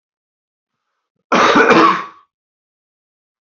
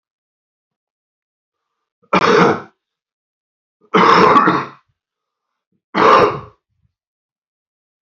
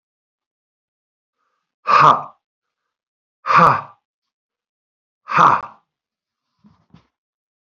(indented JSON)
{
  "cough_length": "3.6 s",
  "cough_amplitude": 32767,
  "cough_signal_mean_std_ratio": 0.37,
  "three_cough_length": "8.0 s",
  "three_cough_amplitude": 32379,
  "three_cough_signal_mean_std_ratio": 0.36,
  "exhalation_length": "7.7 s",
  "exhalation_amplitude": 32317,
  "exhalation_signal_mean_std_ratio": 0.27,
  "survey_phase": "beta (2021-08-13 to 2022-03-07)",
  "age": "45-64",
  "gender": "Male",
  "wearing_mask": "No",
  "symptom_cough_any": true,
  "symptom_runny_or_blocked_nose": true,
  "symptom_fatigue": true,
  "symptom_onset": "4 days",
  "smoker_status": "Ex-smoker",
  "respiratory_condition_asthma": false,
  "respiratory_condition_other": false,
  "recruitment_source": "Test and Trace",
  "submission_delay": "1 day",
  "covid_test_result": "Positive",
  "covid_test_method": "RT-qPCR",
  "covid_ct_value": 18.2,
  "covid_ct_gene": "ORF1ab gene"
}